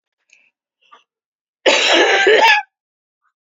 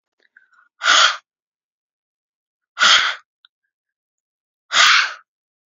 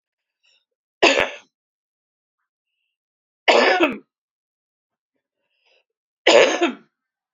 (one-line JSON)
{"cough_length": "3.5 s", "cough_amplitude": 30625, "cough_signal_mean_std_ratio": 0.45, "exhalation_length": "5.7 s", "exhalation_amplitude": 32243, "exhalation_signal_mean_std_ratio": 0.34, "three_cough_length": "7.3 s", "three_cough_amplitude": 32629, "three_cough_signal_mean_std_ratio": 0.3, "survey_phase": "beta (2021-08-13 to 2022-03-07)", "age": "45-64", "gender": "Female", "wearing_mask": "No", "symptom_none": true, "smoker_status": "Never smoked", "respiratory_condition_asthma": true, "respiratory_condition_other": false, "recruitment_source": "REACT", "submission_delay": "2 days", "covid_test_result": "Negative", "covid_test_method": "RT-qPCR", "influenza_a_test_result": "Negative", "influenza_b_test_result": "Negative"}